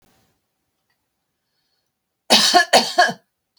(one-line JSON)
{"three_cough_length": "3.6 s", "three_cough_amplitude": 32767, "three_cough_signal_mean_std_ratio": 0.33, "survey_phase": "beta (2021-08-13 to 2022-03-07)", "age": "65+", "gender": "Female", "wearing_mask": "No", "symptom_none": true, "smoker_status": "Never smoked", "respiratory_condition_asthma": false, "respiratory_condition_other": false, "recruitment_source": "REACT", "submission_delay": "2 days", "covid_test_result": "Negative", "covid_test_method": "RT-qPCR"}